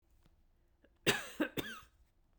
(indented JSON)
{
  "cough_length": "2.4 s",
  "cough_amplitude": 5963,
  "cough_signal_mean_std_ratio": 0.32,
  "survey_phase": "beta (2021-08-13 to 2022-03-07)",
  "age": "45-64",
  "gender": "Female",
  "wearing_mask": "No",
  "symptom_sore_throat": true,
  "symptom_fatigue": true,
  "symptom_headache": true,
  "symptom_other": true,
  "smoker_status": "Never smoked",
  "respiratory_condition_asthma": false,
  "respiratory_condition_other": false,
  "recruitment_source": "Test and Trace",
  "submission_delay": "2 days",
  "covid_test_result": "Positive",
  "covid_test_method": "LFT"
}